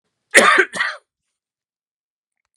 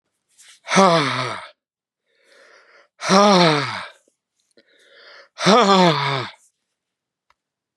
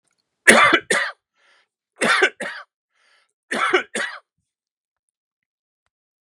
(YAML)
cough_length: 2.6 s
cough_amplitude: 32768
cough_signal_mean_std_ratio: 0.31
exhalation_length: 7.8 s
exhalation_amplitude: 32706
exhalation_signal_mean_std_ratio: 0.4
three_cough_length: 6.2 s
three_cough_amplitude: 32768
three_cough_signal_mean_std_ratio: 0.33
survey_phase: beta (2021-08-13 to 2022-03-07)
age: 65+
gender: Male
wearing_mask: 'No'
symptom_none: true
symptom_onset: 4 days
smoker_status: Ex-smoker
respiratory_condition_asthma: false
respiratory_condition_other: false
recruitment_source: REACT
submission_delay: 2 days
covid_test_result: Negative
covid_test_method: RT-qPCR
influenza_a_test_result: Negative
influenza_b_test_result: Negative